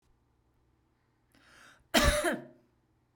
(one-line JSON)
{"cough_length": "3.2 s", "cough_amplitude": 10247, "cough_signal_mean_std_ratio": 0.3, "survey_phase": "beta (2021-08-13 to 2022-03-07)", "age": "18-44", "gender": "Female", "wearing_mask": "Yes", "symptom_fatigue": true, "symptom_onset": "12 days", "smoker_status": "Ex-smoker", "respiratory_condition_asthma": true, "respiratory_condition_other": false, "recruitment_source": "REACT", "submission_delay": "3 days", "covid_test_result": "Negative", "covid_test_method": "RT-qPCR"}